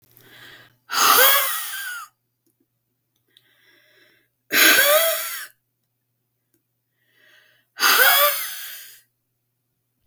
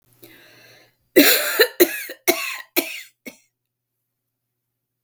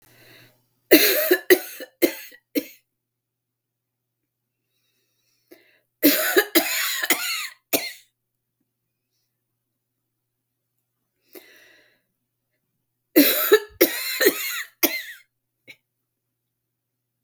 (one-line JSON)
{"exhalation_length": "10.1 s", "exhalation_amplitude": 32719, "exhalation_signal_mean_std_ratio": 0.4, "cough_length": "5.0 s", "cough_amplitude": 32768, "cough_signal_mean_std_ratio": 0.32, "three_cough_length": "17.2 s", "three_cough_amplitude": 32768, "three_cough_signal_mean_std_ratio": 0.31, "survey_phase": "beta (2021-08-13 to 2022-03-07)", "age": "65+", "gender": "Female", "wearing_mask": "No", "symptom_cough_any": true, "symptom_runny_or_blocked_nose": true, "symptom_sore_throat": true, "symptom_fatigue": true, "symptom_other": true, "symptom_onset": "3 days", "smoker_status": "Never smoked", "respiratory_condition_asthma": false, "respiratory_condition_other": false, "recruitment_source": "Test and Trace", "submission_delay": "1 day", "covid_test_result": "Positive", "covid_test_method": "RT-qPCR", "covid_ct_value": 22.0, "covid_ct_gene": "ORF1ab gene"}